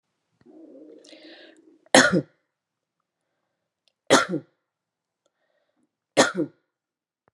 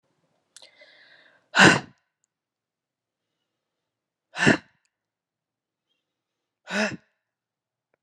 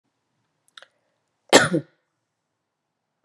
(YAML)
three_cough_length: 7.3 s
three_cough_amplitude: 31677
three_cough_signal_mean_std_ratio: 0.23
exhalation_length: 8.0 s
exhalation_amplitude: 30931
exhalation_signal_mean_std_ratio: 0.2
cough_length: 3.2 s
cough_amplitude: 32768
cough_signal_mean_std_ratio: 0.19
survey_phase: beta (2021-08-13 to 2022-03-07)
age: 45-64
gender: Female
wearing_mask: 'No'
symptom_headache: true
symptom_change_to_sense_of_smell_or_taste: true
symptom_loss_of_taste: true
symptom_onset: 3 days
smoker_status: Ex-smoker
respiratory_condition_asthma: false
respiratory_condition_other: false
recruitment_source: Test and Trace
submission_delay: 2 days
covid_test_result: Positive
covid_test_method: RT-qPCR
covid_ct_value: 17.2
covid_ct_gene: ORF1ab gene
covid_ct_mean: 17.5
covid_viral_load: 1900000 copies/ml
covid_viral_load_category: High viral load (>1M copies/ml)